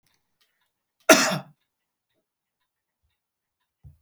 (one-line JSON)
{"cough_length": "4.0 s", "cough_amplitude": 32767, "cough_signal_mean_std_ratio": 0.18, "survey_phase": "alpha (2021-03-01 to 2021-08-12)", "age": "45-64", "gender": "Male", "wearing_mask": "No", "symptom_none": true, "smoker_status": "Never smoked", "respiratory_condition_asthma": false, "respiratory_condition_other": false, "recruitment_source": "REACT", "submission_delay": "1 day", "covid_test_result": "Negative", "covid_test_method": "RT-qPCR"}